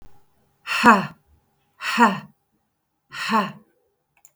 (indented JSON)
{
  "exhalation_length": "4.4 s",
  "exhalation_amplitude": 32643,
  "exhalation_signal_mean_std_ratio": 0.35,
  "survey_phase": "beta (2021-08-13 to 2022-03-07)",
  "age": "65+",
  "gender": "Female",
  "wearing_mask": "No",
  "symptom_none": true,
  "smoker_status": "Ex-smoker",
  "respiratory_condition_asthma": false,
  "respiratory_condition_other": false,
  "recruitment_source": "REACT",
  "submission_delay": "2 days",
  "covid_test_result": "Negative",
  "covid_test_method": "RT-qPCR",
  "influenza_a_test_result": "Unknown/Void",
  "influenza_b_test_result": "Unknown/Void"
}